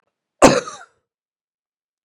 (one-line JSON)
{"cough_length": "2.0 s", "cough_amplitude": 32768, "cough_signal_mean_std_ratio": 0.23, "survey_phase": "beta (2021-08-13 to 2022-03-07)", "age": "65+", "gender": "Male", "wearing_mask": "No", "symptom_cough_any": true, "symptom_runny_or_blocked_nose": true, "symptom_fatigue": true, "symptom_fever_high_temperature": true, "symptom_headache": true, "symptom_change_to_sense_of_smell_or_taste": true, "symptom_loss_of_taste": true, "symptom_onset": "4 days", "smoker_status": "Ex-smoker", "respiratory_condition_asthma": false, "respiratory_condition_other": false, "recruitment_source": "Test and Trace", "submission_delay": "1 day", "covid_test_result": "Positive", "covid_test_method": "ePCR"}